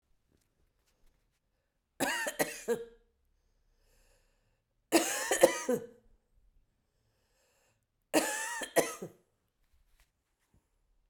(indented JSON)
{
  "three_cough_length": "11.1 s",
  "three_cough_amplitude": 15117,
  "three_cough_signal_mean_std_ratio": 0.3,
  "survey_phase": "beta (2021-08-13 to 2022-03-07)",
  "age": "45-64",
  "gender": "Female",
  "wearing_mask": "No",
  "symptom_cough_any": true,
  "symptom_runny_or_blocked_nose": true,
  "symptom_shortness_of_breath": true,
  "symptom_fatigue": true,
  "symptom_headache": true,
  "symptom_change_to_sense_of_smell_or_taste": true,
  "symptom_onset": "5 days",
  "smoker_status": "Never smoked",
  "respiratory_condition_asthma": false,
  "respiratory_condition_other": false,
  "recruitment_source": "Test and Trace",
  "submission_delay": "2 days",
  "covid_test_result": "Positive",
  "covid_test_method": "RT-qPCR"
}